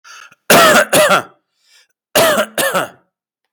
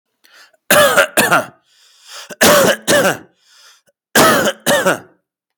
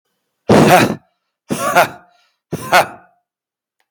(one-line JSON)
{"cough_length": "3.5 s", "cough_amplitude": 32768, "cough_signal_mean_std_ratio": 0.53, "three_cough_length": "5.6 s", "three_cough_amplitude": 32768, "three_cough_signal_mean_std_ratio": 0.52, "exhalation_length": "3.9 s", "exhalation_amplitude": 32768, "exhalation_signal_mean_std_ratio": 0.41, "survey_phase": "beta (2021-08-13 to 2022-03-07)", "age": "45-64", "gender": "Male", "wearing_mask": "No", "symptom_cough_any": true, "symptom_onset": "11 days", "smoker_status": "Never smoked", "respiratory_condition_asthma": false, "respiratory_condition_other": false, "recruitment_source": "REACT", "submission_delay": "1 day", "covid_test_result": "Negative", "covid_test_method": "RT-qPCR"}